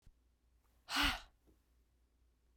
{
  "exhalation_length": "2.6 s",
  "exhalation_amplitude": 2869,
  "exhalation_signal_mean_std_ratio": 0.29,
  "survey_phase": "beta (2021-08-13 to 2022-03-07)",
  "age": "45-64",
  "gender": "Female",
  "wearing_mask": "No",
  "symptom_none": true,
  "smoker_status": "Never smoked",
  "respiratory_condition_asthma": false,
  "respiratory_condition_other": false,
  "recruitment_source": "REACT",
  "submission_delay": "2 days",
  "covid_test_result": "Negative",
  "covid_test_method": "RT-qPCR",
  "influenza_a_test_result": "Negative",
  "influenza_b_test_result": "Negative"
}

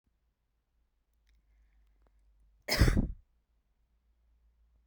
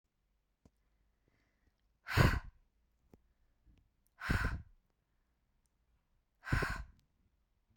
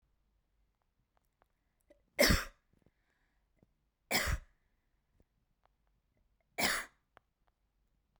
{
  "cough_length": "4.9 s",
  "cough_amplitude": 8951,
  "cough_signal_mean_std_ratio": 0.23,
  "exhalation_length": "7.8 s",
  "exhalation_amplitude": 7615,
  "exhalation_signal_mean_std_ratio": 0.26,
  "three_cough_length": "8.2 s",
  "three_cough_amplitude": 9640,
  "three_cough_signal_mean_std_ratio": 0.24,
  "survey_phase": "beta (2021-08-13 to 2022-03-07)",
  "age": "18-44",
  "gender": "Female",
  "wearing_mask": "No",
  "symptom_none": true,
  "smoker_status": "Never smoked",
  "respiratory_condition_asthma": true,
  "respiratory_condition_other": false,
  "recruitment_source": "REACT",
  "submission_delay": "1 day",
  "covid_test_result": "Negative",
  "covid_test_method": "RT-qPCR"
}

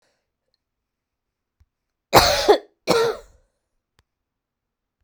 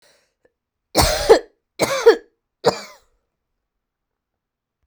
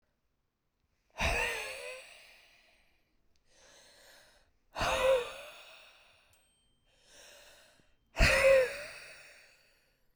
{
  "cough_length": "5.0 s",
  "cough_amplitude": 32768,
  "cough_signal_mean_std_ratio": 0.28,
  "three_cough_length": "4.9 s",
  "three_cough_amplitude": 32768,
  "three_cough_signal_mean_std_ratio": 0.29,
  "exhalation_length": "10.2 s",
  "exhalation_amplitude": 8690,
  "exhalation_signal_mean_std_ratio": 0.34,
  "survey_phase": "beta (2021-08-13 to 2022-03-07)",
  "age": "18-44",
  "gender": "Female",
  "wearing_mask": "No",
  "symptom_shortness_of_breath": true,
  "symptom_sore_throat": true,
  "symptom_diarrhoea": true,
  "symptom_fatigue": true,
  "symptom_fever_high_temperature": true,
  "symptom_onset": "8 days",
  "smoker_status": "Never smoked",
  "respiratory_condition_asthma": true,
  "respiratory_condition_other": false,
  "recruitment_source": "REACT",
  "submission_delay": "14 days",
  "covid_test_result": "Negative",
  "covid_test_method": "RT-qPCR"
}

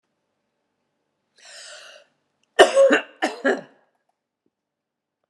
{
  "cough_length": "5.3 s",
  "cough_amplitude": 32767,
  "cough_signal_mean_std_ratio": 0.26,
  "survey_phase": "beta (2021-08-13 to 2022-03-07)",
  "age": "65+",
  "gender": "Female",
  "wearing_mask": "No",
  "symptom_runny_or_blocked_nose": true,
  "symptom_change_to_sense_of_smell_or_taste": true,
  "smoker_status": "Ex-smoker",
  "respiratory_condition_asthma": false,
  "respiratory_condition_other": false,
  "recruitment_source": "Test and Trace",
  "submission_delay": "2 days",
  "covid_test_result": "Positive",
  "covid_test_method": "RT-qPCR",
  "covid_ct_value": 32.8,
  "covid_ct_gene": "N gene",
  "covid_ct_mean": 33.2,
  "covid_viral_load": "13 copies/ml",
  "covid_viral_load_category": "Minimal viral load (< 10K copies/ml)"
}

